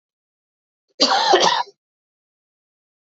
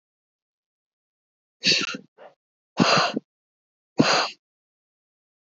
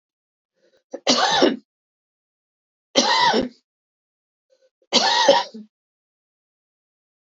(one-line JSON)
{"cough_length": "3.2 s", "cough_amplitude": 26098, "cough_signal_mean_std_ratio": 0.36, "exhalation_length": "5.5 s", "exhalation_amplitude": 23281, "exhalation_signal_mean_std_ratio": 0.32, "three_cough_length": "7.3 s", "three_cough_amplitude": 27716, "three_cough_signal_mean_std_ratio": 0.37, "survey_phase": "beta (2021-08-13 to 2022-03-07)", "age": "18-44", "gender": "Female", "wearing_mask": "No", "symptom_runny_or_blocked_nose": true, "symptom_fatigue": true, "symptom_loss_of_taste": true, "smoker_status": "Never smoked", "respiratory_condition_asthma": false, "respiratory_condition_other": false, "recruitment_source": "Test and Trace", "submission_delay": "0 days", "covid_test_result": "Positive", "covid_test_method": "LFT"}